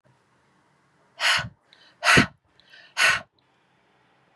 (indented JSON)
{
  "exhalation_length": "4.4 s",
  "exhalation_amplitude": 26054,
  "exhalation_signal_mean_std_ratio": 0.31,
  "survey_phase": "beta (2021-08-13 to 2022-03-07)",
  "age": "45-64",
  "gender": "Female",
  "wearing_mask": "No",
  "symptom_none": true,
  "smoker_status": "Never smoked",
  "respiratory_condition_asthma": false,
  "respiratory_condition_other": false,
  "recruitment_source": "REACT",
  "submission_delay": "2 days",
  "covid_test_result": "Negative",
  "covid_test_method": "RT-qPCR",
  "influenza_a_test_result": "Negative",
  "influenza_b_test_result": "Negative"
}